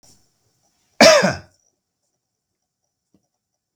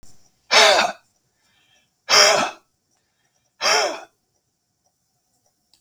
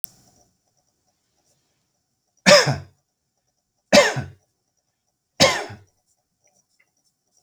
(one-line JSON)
{"cough_length": "3.8 s", "cough_amplitude": 32768, "cough_signal_mean_std_ratio": 0.23, "exhalation_length": "5.8 s", "exhalation_amplitude": 32004, "exhalation_signal_mean_std_ratio": 0.35, "three_cough_length": "7.4 s", "three_cough_amplitude": 32766, "three_cough_signal_mean_std_ratio": 0.24, "survey_phase": "beta (2021-08-13 to 2022-03-07)", "age": "65+", "gender": "Male", "wearing_mask": "No", "symptom_none": true, "symptom_onset": "13 days", "smoker_status": "Ex-smoker", "respiratory_condition_asthma": false, "respiratory_condition_other": false, "recruitment_source": "REACT", "submission_delay": "3 days", "covid_test_result": "Negative", "covid_test_method": "RT-qPCR"}